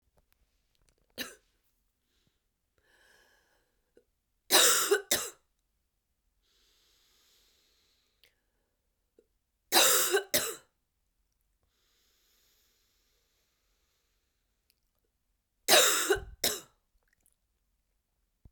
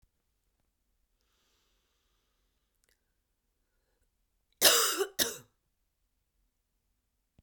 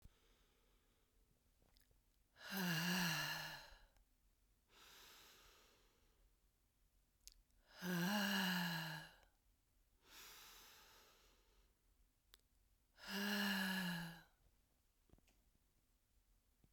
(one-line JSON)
{"three_cough_length": "18.5 s", "three_cough_amplitude": 15775, "three_cough_signal_mean_std_ratio": 0.25, "cough_length": "7.4 s", "cough_amplitude": 14738, "cough_signal_mean_std_ratio": 0.2, "exhalation_length": "16.7 s", "exhalation_amplitude": 1250, "exhalation_signal_mean_std_ratio": 0.42, "survey_phase": "beta (2021-08-13 to 2022-03-07)", "age": "45-64", "gender": "Female", "wearing_mask": "No", "symptom_new_continuous_cough": true, "symptom_runny_or_blocked_nose": true, "symptom_shortness_of_breath": true, "symptom_diarrhoea": true, "symptom_fatigue": true, "symptom_headache": true, "symptom_onset": "4 days", "smoker_status": "Never smoked", "respiratory_condition_asthma": false, "respiratory_condition_other": false, "recruitment_source": "Test and Trace", "submission_delay": "2 days", "covid_test_result": "Positive", "covid_test_method": "RT-qPCR", "covid_ct_value": 16.5, "covid_ct_gene": "N gene"}